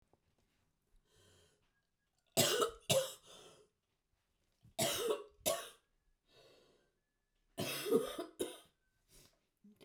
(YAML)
three_cough_length: 9.8 s
three_cough_amplitude: 5130
three_cough_signal_mean_std_ratio: 0.34
survey_phase: beta (2021-08-13 to 2022-03-07)
age: 45-64
gender: Female
wearing_mask: 'No'
symptom_cough_any: true
symptom_runny_or_blocked_nose: true
symptom_sore_throat: true
symptom_fatigue: true
symptom_headache: true
smoker_status: Never smoked
respiratory_condition_asthma: false
respiratory_condition_other: false
recruitment_source: Test and Trace
submission_delay: 2 days
covid_test_result: Positive
covid_test_method: LFT